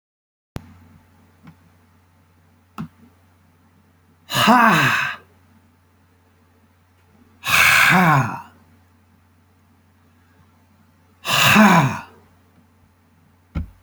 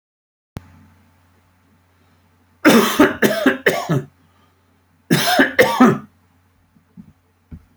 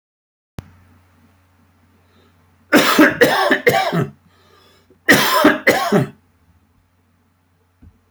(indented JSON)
{
  "exhalation_length": "13.8 s",
  "exhalation_amplitude": 31174,
  "exhalation_signal_mean_std_ratio": 0.35,
  "three_cough_length": "7.8 s",
  "three_cough_amplitude": 30418,
  "three_cough_signal_mean_std_ratio": 0.39,
  "cough_length": "8.1 s",
  "cough_amplitude": 32767,
  "cough_signal_mean_std_ratio": 0.41,
  "survey_phase": "alpha (2021-03-01 to 2021-08-12)",
  "age": "45-64",
  "gender": "Male",
  "wearing_mask": "No",
  "symptom_none": true,
  "smoker_status": "Ex-smoker",
  "respiratory_condition_asthma": false,
  "respiratory_condition_other": false,
  "recruitment_source": "REACT",
  "submission_delay": "1 day",
  "covid_test_result": "Negative",
  "covid_test_method": "RT-qPCR"
}